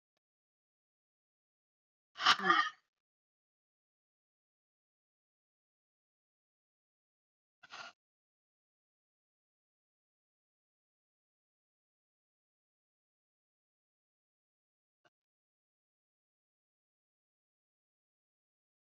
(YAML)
exhalation_length: 18.9 s
exhalation_amplitude: 6549
exhalation_signal_mean_std_ratio: 0.11
survey_phase: beta (2021-08-13 to 2022-03-07)
age: 45-64
gender: Female
wearing_mask: 'Yes'
symptom_cough_any: true
symptom_runny_or_blocked_nose: true
symptom_shortness_of_breath: true
symptom_fatigue: true
symptom_headache: true
symptom_change_to_sense_of_smell_or_taste: true
smoker_status: Never smoked
respiratory_condition_asthma: false
respiratory_condition_other: false
recruitment_source: Test and Trace
submission_delay: 1 day
covid_test_result: Positive
covid_test_method: RT-qPCR
covid_ct_value: 17.3
covid_ct_gene: ORF1ab gene
covid_ct_mean: 17.8
covid_viral_load: 1400000 copies/ml
covid_viral_load_category: High viral load (>1M copies/ml)